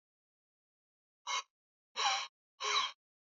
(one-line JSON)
{"exhalation_length": "3.2 s", "exhalation_amplitude": 3767, "exhalation_signal_mean_std_ratio": 0.38, "survey_phase": "beta (2021-08-13 to 2022-03-07)", "age": "45-64", "gender": "Male", "wearing_mask": "No", "symptom_cough_any": true, "symptom_runny_or_blocked_nose": true, "symptom_shortness_of_breath": true, "symptom_sore_throat": true, "symptom_fatigue": true, "smoker_status": "Never smoked", "respiratory_condition_asthma": false, "respiratory_condition_other": false, "recruitment_source": "Test and Trace", "submission_delay": "3 days", "covid_test_result": "Positive", "covid_test_method": "RT-qPCR", "covid_ct_value": 28.2, "covid_ct_gene": "N gene"}